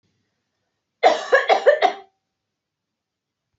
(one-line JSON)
{"cough_length": "3.6 s", "cough_amplitude": 25931, "cough_signal_mean_std_ratio": 0.33, "survey_phase": "beta (2021-08-13 to 2022-03-07)", "age": "18-44", "gender": "Female", "wearing_mask": "No", "symptom_none": true, "symptom_onset": "12 days", "smoker_status": "Never smoked", "respiratory_condition_asthma": false, "respiratory_condition_other": false, "recruitment_source": "REACT", "submission_delay": "2 days", "covid_test_result": "Negative", "covid_test_method": "RT-qPCR", "influenza_a_test_result": "Negative", "influenza_b_test_result": "Negative"}